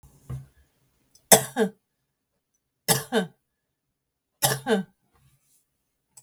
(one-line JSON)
{"three_cough_length": "6.2 s", "three_cough_amplitude": 32768, "three_cough_signal_mean_std_ratio": 0.26, "survey_phase": "beta (2021-08-13 to 2022-03-07)", "age": "45-64", "gender": "Female", "wearing_mask": "No", "symptom_cough_any": true, "symptom_runny_or_blocked_nose": true, "smoker_status": "Ex-smoker", "respiratory_condition_asthma": false, "respiratory_condition_other": false, "recruitment_source": "REACT", "submission_delay": "1 day", "covid_test_result": "Negative", "covid_test_method": "RT-qPCR"}